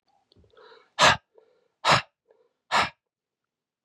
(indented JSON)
{
  "exhalation_length": "3.8 s",
  "exhalation_amplitude": 21520,
  "exhalation_signal_mean_std_ratio": 0.28,
  "survey_phase": "beta (2021-08-13 to 2022-03-07)",
  "age": "45-64",
  "gender": "Male",
  "wearing_mask": "No",
  "symptom_cough_any": true,
  "symptom_runny_or_blocked_nose": true,
  "symptom_loss_of_taste": true,
  "symptom_onset": "3 days",
  "smoker_status": "Never smoked",
  "respiratory_condition_asthma": false,
  "respiratory_condition_other": false,
  "recruitment_source": "Test and Trace",
  "submission_delay": "1 day",
  "covid_test_result": "Positive",
  "covid_test_method": "RT-qPCR",
  "covid_ct_value": 14.8,
  "covid_ct_gene": "ORF1ab gene",
  "covid_ct_mean": 15.0,
  "covid_viral_load": "12000000 copies/ml",
  "covid_viral_load_category": "High viral load (>1M copies/ml)"
}